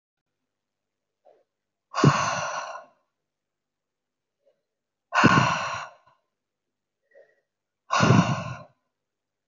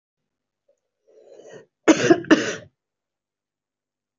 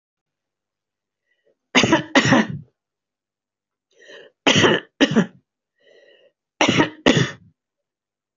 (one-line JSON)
{"exhalation_length": "9.5 s", "exhalation_amplitude": 23596, "exhalation_signal_mean_std_ratio": 0.32, "cough_length": "4.2 s", "cough_amplitude": 25449, "cough_signal_mean_std_ratio": 0.25, "three_cough_length": "8.4 s", "three_cough_amplitude": 28037, "three_cough_signal_mean_std_ratio": 0.35, "survey_phase": "alpha (2021-03-01 to 2021-08-12)", "age": "65+", "gender": "Female", "wearing_mask": "No", "symptom_none": true, "smoker_status": "Never smoked", "respiratory_condition_asthma": false, "respiratory_condition_other": false, "recruitment_source": "REACT", "submission_delay": "2 days", "covid_test_result": "Negative", "covid_test_method": "RT-qPCR"}